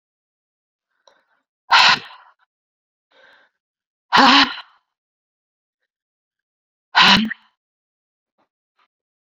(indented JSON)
{
  "exhalation_length": "9.3 s",
  "exhalation_amplitude": 32767,
  "exhalation_signal_mean_std_ratio": 0.26,
  "survey_phase": "beta (2021-08-13 to 2022-03-07)",
  "age": "18-44",
  "gender": "Female",
  "wearing_mask": "No",
  "symptom_cough_any": true,
  "symptom_runny_or_blocked_nose": true,
  "symptom_fatigue": true,
  "symptom_headache": true,
  "symptom_change_to_sense_of_smell_or_taste": true,
  "symptom_loss_of_taste": true,
  "symptom_onset": "4 days",
  "smoker_status": "Never smoked",
  "respiratory_condition_asthma": true,
  "respiratory_condition_other": false,
  "recruitment_source": "Test and Trace",
  "submission_delay": "2 days",
  "covid_test_result": "Positive",
  "covid_test_method": "LAMP"
}